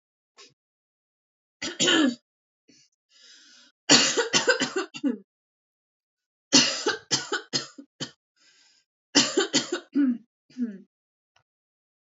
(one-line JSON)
{"three_cough_length": "12.0 s", "three_cough_amplitude": 26043, "three_cough_signal_mean_std_ratio": 0.37, "survey_phase": "alpha (2021-03-01 to 2021-08-12)", "age": "18-44", "gender": "Female", "wearing_mask": "No", "symptom_none": true, "smoker_status": "Never smoked", "respiratory_condition_asthma": true, "respiratory_condition_other": false, "recruitment_source": "REACT", "submission_delay": "2 days", "covid_test_result": "Negative", "covid_test_method": "RT-qPCR"}